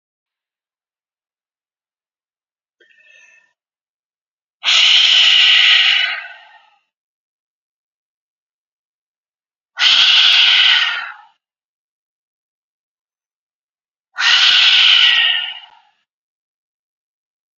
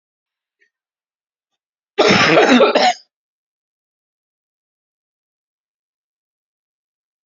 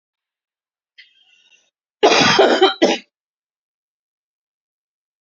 {"exhalation_length": "17.6 s", "exhalation_amplitude": 32760, "exhalation_signal_mean_std_ratio": 0.41, "three_cough_length": "7.3 s", "three_cough_amplitude": 32768, "three_cough_signal_mean_std_ratio": 0.29, "cough_length": "5.2 s", "cough_amplitude": 32257, "cough_signal_mean_std_ratio": 0.32, "survey_phase": "beta (2021-08-13 to 2022-03-07)", "age": "45-64", "gender": "Female", "wearing_mask": "No", "symptom_cough_any": true, "symptom_runny_or_blocked_nose": true, "symptom_sore_throat": true, "symptom_fatigue": true, "symptom_headache": true, "symptom_change_to_sense_of_smell_or_taste": true, "symptom_loss_of_taste": true, "symptom_onset": "6 days", "smoker_status": "Never smoked", "respiratory_condition_asthma": false, "respiratory_condition_other": false, "recruitment_source": "Test and Trace", "submission_delay": "2 days", "covid_test_result": "Positive", "covid_test_method": "RT-qPCR", "covid_ct_value": 26.2, "covid_ct_gene": "ORF1ab gene", "covid_ct_mean": 27.2, "covid_viral_load": "1200 copies/ml", "covid_viral_load_category": "Minimal viral load (< 10K copies/ml)"}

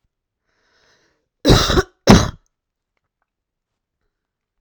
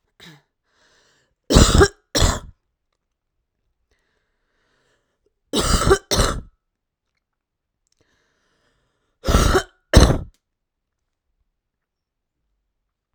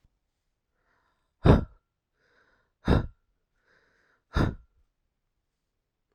{"cough_length": "4.6 s", "cough_amplitude": 32768, "cough_signal_mean_std_ratio": 0.26, "three_cough_length": "13.1 s", "three_cough_amplitude": 32768, "three_cough_signal_mean_std_ratio": 0.28, "exhalation_length": "6.1 s", "exhalation_amplitude": 19836, "exhalation_signal_mean_std_ratio": 0.21, "survey_phase": "beta (2021-08-13 to 2022-03-07)", "age": "18-44", "gender": "Female", "wearing_mask": "No", "symptom_cough_any": true, "symptom_runny_or_blocked_nose": true, "symptom_sore_throat": true, "symptom_fatigue": true, "symptom_headache": true, "symptom_other": true, "smoker_status": "Current smoker (1 to 10 cigarettes per day)", "respiratory_condition_asthma": false, "respiratory_condition_other": false, "recruitment_source": "Test and Trace", "submission_delay": "2 days", "covid_test_result": "Positive", "covid_test_method": "LFT"}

